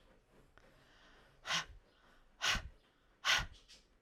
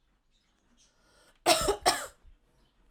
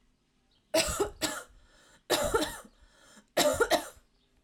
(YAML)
exhalation_length: 4.0 s
exhalation_amplitude: 4038
exhalation_signal_mean_std_ratio: 0.35
cough_length: 2.9 s
cough_amplitude: 13956
cough_signal_mean_std_ratio: 0.31
three_cough_length: 4.4 s
three_cough_amplitude: 8979
three_cough_signal_mean_std_ratio: 0.45
survey_phase: alpha (2021-03-01 to 2021-08-12)
age: 18-44
gender: Female
wearing_mask: 'No'
symptom_none: true
smoker_status: Never smoked
respiratory_condition_asthma: false
respiratory_condition_other: false
recruitment_source: REACT
submission_delay: 3 days
covid_test_result: Negative
covid_test_method: RT-qPCR